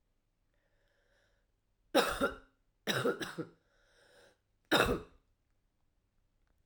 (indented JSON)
{
  "three_cough_length": "6.7 s",
  "three_cough_amplitude": 7202,
  "three_cough_signal_mean_std_ratio": 0.31,
  "survey_phase": "alpha (2021-03-01 to 2021-08-12)",
  "age": "18-44",
  "gender": "Female",
  "wearing_mask": "No",
  "symptom_cough_any": true,
  "symptom_headache": true,
  "symptom_change_to_sense_of_smell_or_taste": true,
  "smoker_status": "Never smoked",
  "respiratory_condition_asthma": false,
  "respiratory_condition_other": false,
  "recruitment_source": "Test and Trace",
  "submission_delay": "2 days",
  "covid_test_result": "Positive",
  "covid_test_method": "RT-qPCR",
  "covid_ct_value": 18.9,
  "covid_ct_gene": "N gene",
  "covid_ct_mean": 20.0,
  "covid_viral_load": "280000 copies/ml",
  "covid_viral_load_category": "Low viral load (10K-1M copies/ml)"
}